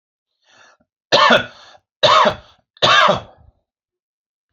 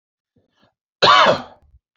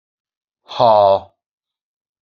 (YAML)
three_cough_length: 4.5 s
three_cough_amplitude: 30029
three_cough_signal_mean_std_ratio: 0.39
cough_length: 2.0 s
cough_amplitude: 29688
cough_signal_mean_std_ratio: 0.36
exhalation_length: 2.2 s
exhalation_amplitude: 27777
exhalation_signal_mean_std_ratio: 0.35
survey_phase: beta (2021-08-13 to 2022-03-07)
age: 45-64
gender: Male
wearing_mask: 'No'
symptom_cough_any: true
smoker_status: Never smoked
respiratory_condition_asthma: false
respiratory_condition_other: false
recruitment_source: REACT
submission_delay: 2 days
covid_test_result: Negative
covid_test_method: RT-qPCR
influenza_a_test_result: Negative
influenza_b_test_result: Negative